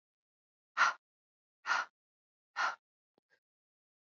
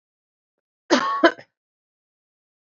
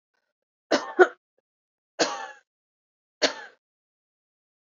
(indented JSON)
{
  "exhalation_length": "4.2 s",
  "exhalation_amplitude": 4603,
  "exhalation_signal_mean_std_ratio": 0.26,
  "cough_length": "2.6 s",
  "cough_amplitude": 24989,
  "cough_signal_mean_std_ratio": 0.27,
  "three_cough_length": "4.8 s",
  "three_cough_amplitude": 25508,
  "three_cough_signal_mean_std_ratio": 0.21,
  "survey_phase": "beta (2021-08-13 to 2022-03-07)",
  "age": "18-44",
  "gender": "Female",
  "wearing_mask": "No",
  "symptom_cough_any": true,
  "symptom_runny_or_blocked_nose": true,
  "symptom_sore_throat": true,
  "symptom_fatigue": true,
  "smoker_status": "Never smoked",
  "respiratory_condition_asthma": false,
  "respiratory_condition_other": false,
  "recruitment_source": "Test and Trace",
  "submission_delay": "2 days",
  "covid_test_result": "Positive",
  "covid_test_method": "RT-qPCR",
  "covid_ct_value": 17.8,
  "covid_ct_gene": "ORF1ab gene",
  "covid_ct_mean": 18.1,
  "covid_viral_load": "1200000 copies/ml",
  "covid_viral_load_category": "High viral load (>1M copies/ml)"
}